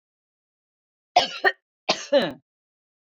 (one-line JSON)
{"cough_length": "3.2 s", "cough_amplitude": 21073, "cough_signal_mean_std_ratio": 0.29, "survey_phase": "beta (2021-08-13 to 2022-03-07)", "age": "45-64", "gender": "Female", "wearing_mask": "No", "symptom_none": true, "smoker_status": "Never smoked", "respiratory_condition_asthma": false, "respiratory_condition_other": false, "recruitment_source": "REACT", "submission_delay": "2 days", "covid_test_result": "Negative", "covid_test_method": "RT-qPCR"}